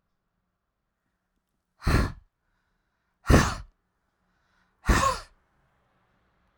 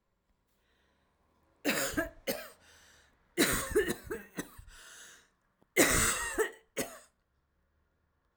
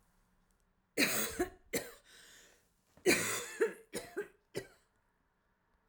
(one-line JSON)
{"exhalation_length": "6.6 s", "exhalation_amplitude": 20021, "exhalation_signal_mean_std_ratio": 0.27, "cough_length": "8.4 s", "cough_amplitude": 10056, "cough_signal_mean_std_ratio": 0.39, "three_cough_length": "5.9 s", "three_cough_amplitude": 5479, "three_cough_signal_mean_std_ratio": 0.38, "survey_phase": "alpha (2021-03-01 to 2021-08-12)", "age": "45-64", "gender": "Female", "wearing_mask": "No", "symptom_none": true, "smoker_status": "Ex-smoker", "respiratory_condition_asthma": false, "respiratory_condition_other": false, "recruitment_source": "REACT", "submission_delay": "1 day", "covid_test_result": "Negative", "covid_test_method": "RT-qPCR"}